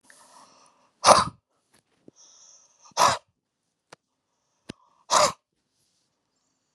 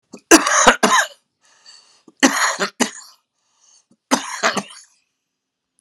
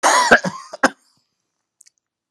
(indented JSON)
{
  "exhalation_length": "6.7 s",
  "exhalation_amplitude": 32701,
  "exhalation_signal_mean_std_ratio": 0.23,
  "three_cough_length": "5.8 s",
  "three_cough_amplitude": 32768,
  "three_cough_signal_mean_std_ratio": 0.36,
  "cough_length": "2.3 s",
  "cough_amplitude": 32768,
  "cough_signal_mean_std_ratio": 0.35,
  "survey_phase": "alpha (2021-03-01 to 2021-08-12)",
  "age": "65+",
  "gender": "Male",
  "wearing_mask": "No",
  "symptom_none": true,
  "smoker_status": "Never smoked",
  "respiratory_condition_asthma": false,
  "respiratory_condition_other": false,
  "recruitment_source": "REACT",
  "submission_delay": "2 days",
  "covid_test_result": "Negative",
  "covid_test_method": "RT-qPCR"
}